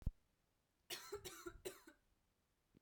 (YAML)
three_cough_length: 2.8 s
three_cough_amplitude: 1406
three_cough_signal_mean_std_ratio: 0.34
survey_phase: beta (2021-08-13 to 2022-03-07)
age: 18-44
gender: Female
wearing_mask: 'No'
symptom_none: true
symptom_onset: 13 days
smoker_status: Never smoked
respiratory_condition_asthma: false
respiratory_condition_other: false
recruitment_source: REACT
submission_delay: 1 day
covid_test_result: Negative
covid_test_method: RT-qPCR
influenza_a_test_result: Negative
influenza_b_test_result: Negative